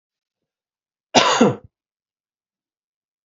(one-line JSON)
{"cough_length": "3.2 s", "cough_amplitude": 32767, "cough_signal_mean_std_ratio": 0.26, "survey_phase": "beta (2021-08-13 to 2022-03-07)", "age": "45-64", "gender": "Male", "wearing_mask": "No", "symptom_cough_any": true, "symptom_runny_or_blocked_nose": true, "symptom_fatigue": true, "symptom_fever_high_temperature": true, "symptom_headache": true, "symptom_change_to_sense_of_smell_or_taste": true, "symptom_loss_of_taste": true, "symptom_onset": "3 days", "smoker_status": "Never smoked", "respiratory_condition_asthma": false, "respiratory_condition_other": false, "recruitment_source": "Test and Trace", "submission_delay": "2 days", "covid_test_result": "Positive", "covid_test_method": "RT-qPCR", "covid_ct_value": 16.0, "covid_ct_gene": "ORF1ab gene", "covid_ct_mean": 16.6, "covid_viral_load": "3600000 copies/ml", "covid_viral_load_category": "High viral load (>1M copies/ml)"}